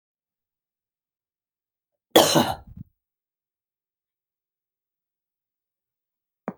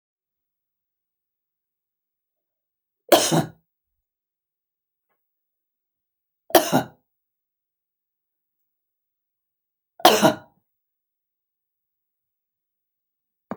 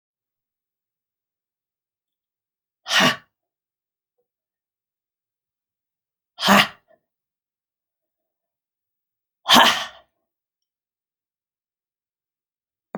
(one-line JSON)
{"cough_length": "6.6 s", "cough_amplitude": 30375, "cough_signal_mean_std_ratio": 0.17, "three_cough_length": "13.6 s", "three_cough_amplitude": 32768, "three_cough_signal_mean_std_ratio": 0.18, "exhalation_length": "13.0 s", "exhalation_amplitude": 32621, "exhalation_signal_mean_std_ratio": 0.19, "survey_phase": "alpha (2021-03-01 to 2021-08-12)", "age": "45-64", "gender": "Female", "wearing_mask": "No", "symptom_none": true, "symptom_onset": "12 days", "smoker_status": "Never smoked", "respiratory_condition_asthma": false, "respiratory_condition_other": false, "recruitment_source": "REACT", "submission_delay": "1 day", "covid_test_result": "Negative", "covid_test_method": "RT-qPCR"}